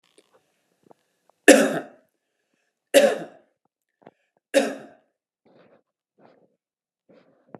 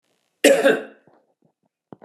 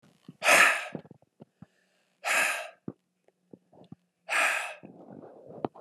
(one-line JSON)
{"three_cough_length": "7.6 s", "three_cough_amplitude": 32767, "three_cough_signal_mean_std_ratio": 0.22, "cough_length": "2.0 s", "cough_amplitude": 31518, "cough_signal_mean_std_ratio": 0.33, "exhalation_length": "5.8 s", "exhalation_amplitude": 14608, "exhalation_signal_mean_std_ratio": 0.37, "survey_phase": "beta (2021-08-13 to 2022-03-07)", "age": "45-64", "gender": "Male", "wearing_mask": "No", "symptom_fatigue": true, "symptom_fever_high_temperature": true, "symptom_headache": true, "symptom_onset": "8 days", "smoker_status": "Ex-smoker", "respiratory_condition_asthma": false, "respiratory_condition_other": false, "recruitment_source": "Test and Trace", "submission_delay": "2 days", "covid_test_result": "Positive", "covid_test_method": "RT-qPCR", "covid_ct_value": 23.1, "covid_ct_gene": "ORF1ab gene", "covid_ct_mean": 24.5, "covid_viral_load": "9400 copies/ml", "covid_viral_load_category": "Minimal viral load (< 10K copies/ml)"}